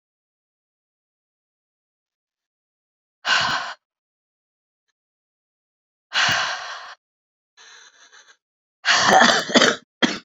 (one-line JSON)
{"exhalation_length": "10.2 s", "exhalation_amplitude": 28032, "exhalation_signal_mean_std_ratio": 0.32, "survey_phase": "beta (2021-08-13 to 2022-03-07)", "age": "45-64", "gender": "Female", "wearing_mask": "No", "symptom_cough_any": true, "symptom_sore_throat": true, "symptom_fatigue": true, "symptom_other": true, "smoker_status": "Ex-smoker", "respiratory_condition_asthma": false, "respiratory_condition_other": false, "recruitment_source": "Test and Trace", "submission_delay": "2 days", "covid_test_result": "Positive", "covid_test_method": "RT-qPCR", "covid_ct_value": 23.3, "covid_ct_gene": "N gene", "covid_ct_mean": 23.3, "covid_viral_load": "22000 copies/ml", "covid_viral_load_category": "Low viral load (10K-1M copies/ml)"}